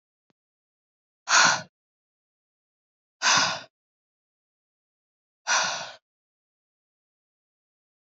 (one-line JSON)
{"exhalation_length": "8.2 s", "exhalation_amplitude": 18414, "exhalation_signal_mean_std_ratio": 0.26, "survey_phase": "alpha (2021-03-01 to 2021-08-12)", "age": "18-44", "gender": "Female", "wearing_mask": "No", "symptom_none": true, "symptom_onset": "8 days", "smoker_status": "Never smoked", "respiratory_condition_asthma": false, "respiratory_condition_other": false, "recruitment_source": "Test and Trace", "submission_delay": "2 days", "covid_test_result": "Positive", "covid_test_method": "RT-qPCR", "covid_ct_value": 26.5, "covid_ct_gene": "S gene", "covid_ct_mean": 26.9, "covid_viral_load": "1500 copies/ml", "covid_viral_load_category": "Minimal viral load (< 10K copies/ml)"}